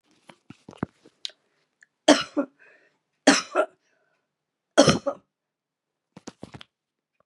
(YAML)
three_cough_length: 7.3 s
three_cough_amplitude: 30632
three_cough_signal_mean_std_ratio: 0.23
survey_phase: beta (2021-08-13 to 2022-03-07)
age: 45-64
gender: Female
wearing_mask: 'No'
symptom_cough_any: true
symptom_runny_or_blocked_nose: true
symptom_sore_throat: true
symptom_headache: true
symptom_onset: 2 days
smoker_status: Never smoked
respiratory_condition_asthma: false
respiratory_condition_other: false
recruitment_source: Test and Trace
submission_delay: 1 day
covid_test_result: Positive
covid_test_method: RT-qPCR
covid_ct_value: 22.2
covid_ct_gene: ORF1ab gene
covid_ct_mean: 22.5
covid_viral_load: 41000 copies/ml
covid_viral_load_category: Low viral load (10K-1M copies/ml)